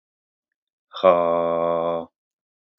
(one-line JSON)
{"exhalation_length": "2.8 s", "exhalation_amplitude": 27542, "exhalation_signal_mean_std_ratio": 0.46, "survey_phase": "beta (2021-08-13 to 2022-03-07)", "age": "45-64", "gender": "Male", "wearing_mask": "No", "symptom_none": true, "smoker_status": "Ex-smoker", "respiratory_condition_asthma": false, "respiratory_condition_other": false, "recruitment_source": "REACT", "submission_delay": "6 days", "covid_test_result": "Negative", "covid_test_method": "RT-qPCR", "influenza_a_test_result": "Negative", "influenza_b_test_result": "Negative"}